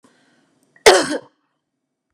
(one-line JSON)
{"cough_length": "2.1 s", "cough_amplitude": 32768, "cough_signal_mean_std_ratio": 0.26, "survey_phase": "beta (2021-08-13 to 2022-03-07)", "age": "65+", "gender": "Female", "wearing_mask": "No", "symptom_none": true, "smoker_status": "Ex-smoker", "respiratory_condition_asthma": false, "respiratory_condition_other": false, "recruitment_source": "REACT", "submission_delay": "2 days", "covid_test_result": "Negative", "covid_test_method": "RT-qPCR", "influenza_a_test_result": "Negative", "influenza_b_test_result": "Negative"}